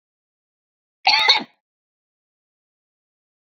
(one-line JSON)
{"cough_length": "3.5 s", "cough_amplitude": 27772, "cough_signal_mean_std_ratio": 0.24, "survey_phase": "beta (2021-08-13 to 2022-03-07)", "age": "45-64", "gender": "Female", "wearing_mask": "No", "symptom_none": true, "smoker_status": "Never smoked", "respiratory_condition_asthma": false, "respiratory_condition_other": false, "recruitment_source": "REACT", "submission_delay": "16 days", "covid_test_result": "Negative", "covid_test_method": "RT-qPCR"}